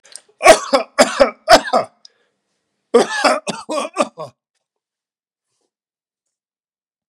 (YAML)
cough_length: 7.1 s
cough_amplitude: 32768
cough_signal_mean_std_ratio: 0.32
survey_phase: beta (2021-08-13 to 2022-03-07)
age: 65+
gender: Male
wearing_mask: 'No'
symptom_none: true
smoker_status: Ex-smoker
respiratory_condition_asthma: false
respiratory_condition_other: false
recruitment_source: REACT
submission_delay: 2 days
covid_test_result: Negative
covid_test_method: RT-qPCR
influenza_a_test_result: Negative
influenza_b_test_result: Negative